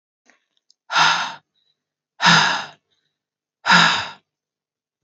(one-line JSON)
{"exhalation_length": "5.0 s", "exhalation_amplitude": 32600, "exhalation_signal_mean_std_ratio": 0.37, "survey_phase": "alpha (2021-03-01 to 2021-08-12)", "age": "45-64", "gender": "Female", "wearing_mask": "No", "symptom_cough_any": true, "symptom_diarrhoea": true, "symptom_fatigue": true, "symptom_headache": true, "symptom_onset": "6 days", "smoker_status": "Never smoked", "respiratory_condition_asthma": false, "respiratory_condition_other": false, "recruitment_source": "Test and Trace", "submission_delay": "2 days", "covid_test_result": "Positive", "covid_test_method": "RT-qPCR", "covid_ct_value": 25.5, "covid_ct_gene": "ORF1ab gene", "covid_ct_mean": 26.4, "covid_viral_load": "2200 copies/ml", "covid_viral_load_category": "Minimal viral load (< 10K copies/ml)"}